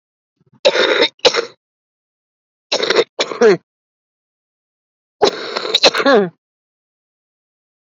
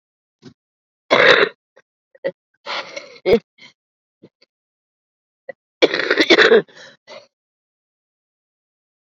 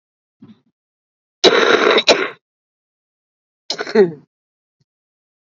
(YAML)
three_cough_length: 7.9 s
three_cough_amplitude: 32768
three_cough_signal_mean_std_ratio: 0.37
exhalation_length: 9.1 s
exhalation_amplitude: 32768
exhalation_signal_mean_std_ratio: 0.29
cough_length: 5.5 s
cough_amplitude: 32767
cough_signal_mean_std_ratio: 0.33
survey_phase: alpha (2021-03-01 to 2021-08-12)
age: 18-44
gender: Female
wearing_mask: 'No'
symptom_cough_any: true
symptom_new_continuous_cough: true
symptom_shortness_of_breath: true
symptom_fatigue: true
symptom_onset: 5 days
smoker_status: Current smoker (1 to 10 cigarettes per day)
respiratory_condition_asthma: false
respiratory_condition_other: true
recruitment_source: REACT
submission_delay: 1 day
covid_test_result: Negative
covid_test_method: RT-qPCR